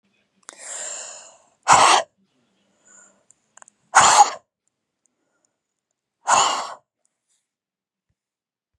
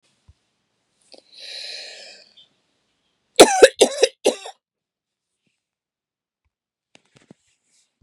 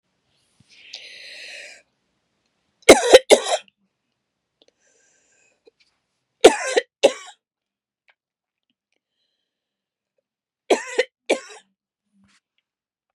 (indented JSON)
{
  "exhalation_length": "8.8 s",
  "exhalation_amplitude": 31832,
  "exhalation_signal_mean_std_ratio": 0.28,
  "cough_length": "8.0 s",
  "cough_amplitude": 32768,
  "cough_signal_mean_std_ratio": 0.19,
  "three_cough_length": "13.1 s",
  "three_cough_amplitude": 32768,
  "three_cough_signal_mean_std_ratio": 0.19,
  "survey_phase": "beta (2021-08-13 to 2022-03-07)",
  "age": "45-64",
  "gender": "Female",
  "wearing_mask": "No",
  "symptom_none": true,
  "smoker_status": "Ex-smoker",
  "respiratory_condition_asthma": true,
  "respiratory_condition_other": false,
  "recruitment_source": "REACT",
  "submission_delay": "0 days",
  "covid_test_result": "Negative",
  "covid_test_method": "RT-qPCR",
  "influenza_a_test_result": "Negative",
  "influenza_b_test_result": "Negative"
}